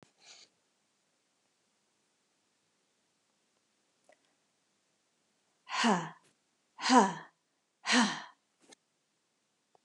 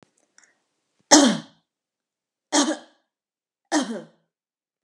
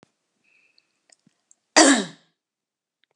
{
  "exhalation_length": "9.8 s",
  "exhalation_amplitude": 12111,
  "exhalation_signal_mean_std_ratio": 0.23,
  "three_cough_length": "4.8 s",
  "three_cough_amplitude": 32768,
  "three_cough_signal_mean_std_ratio": 0.27,
  "cough_length": "3.2 s",
  "cough_amplitude": 30046,
  "cough_signal_mean_std_ratio": 0.23,
  "survey_phase": "beta (2021-08-13 to 2022-03-07)",
  "age": "18-44",
  "gender": "Female",
  "wearing_mask": "No",
  "symptom_none": true,
  "smoker_status": "Never smoked",
  "respiratory_condition_asthma": false,
  "respiratory_condition_other": false,
  "recruitment_source": "REACT",
  "submission_delay": "1 day",
  "covid_test_result": "Negative",
  "covid_test_method": "RT-qPCR"
}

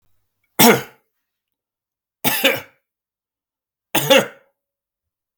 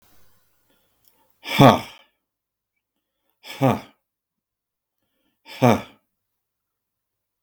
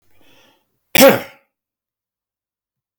{
  "three_cough_length": "5.4 s",
  "three_cough_amplitude": 32768,
  "three_cough_signal_mean_std_ratio": 0.29,
  "exhalation_length": "7.4 s",
  "exhalation_amplitude": 32768,
  "exhalation_signal_mean_std_ratio": 0.21,
  "cough_length": "3.0 s",
  "cough_amplitude": 32768,
  "cough_signal_mean_std_ratio": 0.23,
  "survey_phase": "beta (2021-08-13 to 2022-03-07)",
  "age": "65+",
  "gender": "Male",
  "wearing_mask": "No",
  "symptom_none": true,
  "smoker_status": "Never smoked",
  "recruitment_source": "REACT",
  "submission_delay": "1 day",
  "covid_test_result": "Negative",
  "covid_test_method": "RT-qPCR"
}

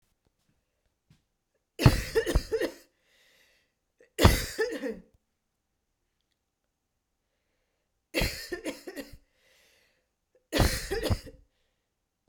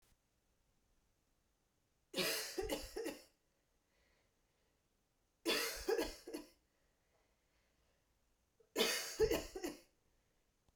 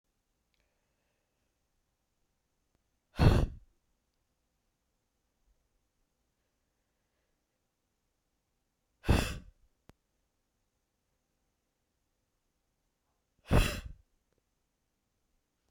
{
  "cough_length": "12.3 s",
  "cough_amplitude": 23944,
  "cough_signal_mean_std_ratio": 0.29,
  "three_cough_length": "10.8 s",
  "three_cough_amplitude": 2594,
  "three_cough_signal_mean_std_ratio": 0.37,
  "exhalation_length": "15.7 s",
  "exhalation_amplitude": 10388,
  "exhalation_signal_mean_std_ratio": 0.18,
  "survey_phase": "beta (2021-08-13 to 2022-03-07)",
  "age": "18-44",
  "gender": "Female",
  "wearing_mask": "No",
  "symptom_cough_any": true,
  "symptom_runny_or_blocked_nose": true,
  "symptom_fatigue": true,
  "symptom_headache": true,
  "symptom_change_to_sense_of_smell_or_taste": true,
  "symptom_onset": "8 days",
  "smoker_status": "Ex-smoker",
  "respiratory_condition_asthma": false,
  "respiratory_condition_other": false,
  "recruitment_source": "Test and Trace",
  "submission_delay": "2 days",
  "covid_test_result": "Positive",
  "covid_test_method": "RT-qPCR",
  "covid_ct_value": 30.4,
  "covid_ct_gene": "N gene"
}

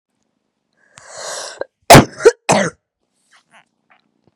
{
  "cough_length": "4.4 s",
  "cough_amplitude": 32768,
  "cough_signal_mean_std_ratio": 0.26,
  "survey_phase": "beta (2021-08-13 to 2022-03-07)",
  "age": "18-44",
  "gender": "Female",
  "wearing_mask": "No",
  "symptom_new_continuous_cough": true,
  "symptom_runny_or_blocked_nose": true,
  "symptom_shortness_of_breath": true,
  "symptom_sore_throat": true,
  "symptom_diarrhoea": true,
  "symptom_fatigue": true,
  "symptom_fever_high_temperature": true,
  "symptom_headache": true,
  "symptom_change_to_sense_of_smell_or_taste": true,
  "symptom_loss_of_taste": true,
  "symptom_onset": "3 days",
  "smoker_status": "Current smoker (e-cigarettes or vapes only)",
  "respiratory_condition_asthma": false,
  "respiratory_condition_other": false,
  "recruitment_source": "Test and Trace",
  "submission_delay": "1 day",
  "covid_test_result": "Positive",
  "covid_test_method": "RT-qPCR",
  "covid_ct_value": 20.7,
  "covid_ct_gene": "ORF1ab gene",
  "covid_ct_mean": 21.3,
  "covid_viral_load": "99000 copies/ml",
  "covid_viral_load_category": "Low viral load (10K-1M copies/ml)"
}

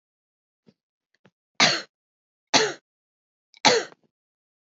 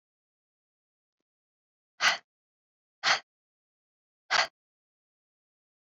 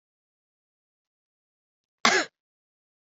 {
  "three_cough_length": "4.6 s",
  "three_cough_amplitude": 26862,
  "three_cough_signal_mean_std_ratio": 0.26,
  "exhalation_length": "5.8 s",
  "exhalation_amplitude": 11125,
  "exhalation_signal_mean_std_ratio": 0.21,
  "cough_length": "3.1 s",
  "cough_amplitude": 28441,
  "cough_signal_mean_std_ratio": 0.18,
  "survey_phase": "beta (2021-08-13 to 2022-03-07)",
  "age": "18-44",
  "gender": "Female",
  "wearing_mask": "No",
  "symptom_fatigue": true,
  "symptom_headache": true,
  "symptom_other": true,
  "smoker_status": "Never smoked",
  "respiratory_condition_asthma": false,
  "respiratory_condition_other": false,
  "recruitment_source": "Test and Trace",
  "submission_delay": "1 day",
  "covid_test_result": "Positive",
  "covid_test_method": "LFT"
}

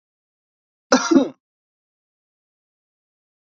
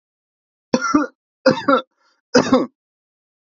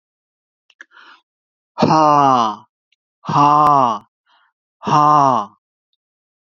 {
  "cough_length": "3.4 s",
  "cough_amplitude": 27747,
  "cough_signal_mean_std_ratio": 0.22,
  "three_cough_length": "3.6 s",
  "three_cough_amplitude": 30027,
  "three_cough_signal_mean_std_ratio": 0.36,
  "exhalation_length": "6.6 s",
  "exhalation_amplitude": 28557,
  "exhalation_signal_mean_std_ratio": 0.44,
  "survey_phase": "beta (2021-08-13 to 2022-03-07)",
  "age": "18-44",
  "gender": "Male",
  "wearing_mask": "No",
  "symptom_none": true,
  "smoker_status": "Never smoked",
  "respiratory_condition_asthma": false,
  "respiratory_condition_other": false,
  "recruitment_source": "Test and Trace",
  "submission_delay": "2 days",
  "covid_test_result": "Positive",
  "covid_test_method": "RT-qPCR",
  "covid_ct_value": 26.7,
  "covid_ct_gene": "ORF1ab gene",
  "covid_ct_mean": 26.9,
  "covid_viral_load": "1400 copies/ml",
  "covid_viral_load_category": "Minimal viral load (< 10K copies/ml)"
}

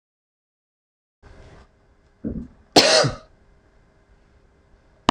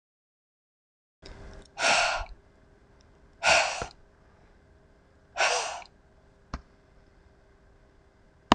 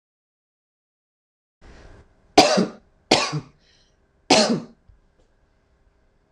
{
  "cough_length": "5.1 s",
  "cough_amplitude": 26028,
  "cough_signal_mean_std_ratio": 0.24,
  "exhalation_length": "8.5 s",
  "exhalation_amplitude": 26027,
  "exhalation_signal_mean_std_ratio": 0.31,
  "three_cough_length": "6.3 s",
  "three_cough_amplitude": 26028,
  "three_cough_signal_mean_std_ratio": 0.28,
  "survey_phase": "beta (2021-08-13 to 2022-03-07)",
  "age": "45-64",
  "gender": "Female",
  "wearing_mask": "No",
  "symptom_none": true,
  "smoker_status": "Never smoked",
  "respiratory_condition_asthma": false,
  "respiratory_condition_other": false,
  "recruitment_source": "REACT",
  "submission_delay": "2 days",
  "covid_test_result": "Negative",
  "covid_test_method": "RT-qPCR"
}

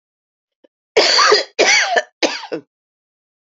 {
  "three_cough_length": "3.5 s",
  "three_cough_amplitude": 32768,
  "three_cough_signal_mean_std_ratio": 0.46,
  "survey_phase": "alpha (2021-03-01 to 2021-08-12)",
  "age": "45-64",
  "gender": "Female",
  "wearing_mask": "Yes",
  "symptom_cough_any": true,
  "symptom_fatigue": true,
  "symptom_fever_high_temperature": true,
  "symptom_headache": true,
  "symptom_loss_of_taste": true,
  "symptom_onset": "8 days",
  "smoker_status": "Never smoked",
  "respiratory_condition_asthma": false,
  "respiratory_condition_other": false,
  "recruitment_source": "Test and Trace",
  "submission_delay": "2 days",
  "covid_test_result": "Positive",
  "covid_test_method": "RT-qPCR"
}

